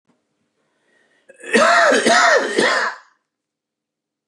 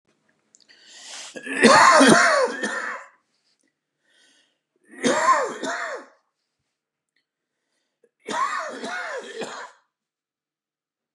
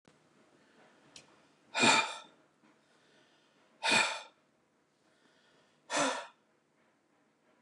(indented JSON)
{
  "cough_length": "4.3 s",
  "cough_amplitude": 28829,
  "cough_signal_mean_std_ratio": 0.49,
  "three_cough_length": "11.1 s",
  "three_cough_amplitude": 32123,
  "three_cough_signal_mean_std_ratio": 0.37,
  "exhalation_length": "7.6 s",
  "exhalation_amplitude": 7650,
  "exhalation_signal_mean_std_ratio": 0.3,
  "survey_phase": "beta (2021-08-13 to 2022-03-07)",
  "age": "45-64",
  "gender": "Male",
  "wearing_mask": "No",
  "symptom_cough_any": true,
  "symptom_runny_or_blocked_nose": true,
  "symptom_sore_throat": true,
  "symptom_fatigue": true,
  "symptom_onset": "5 days",
  "smoker_status": "Never smoked",
  "respiratory_condition_asthma": false,
  "respiratory_condition_other": false,
  "recruitment_source": "Test and Trace",
  "submission_delay": "2 days",
  "covid_test_result": "Positive",
  "covid_test_method": "RT-qPCR",
  "covid_ct_value": 18.2,
  "covid_ct_gene": "N gene"
}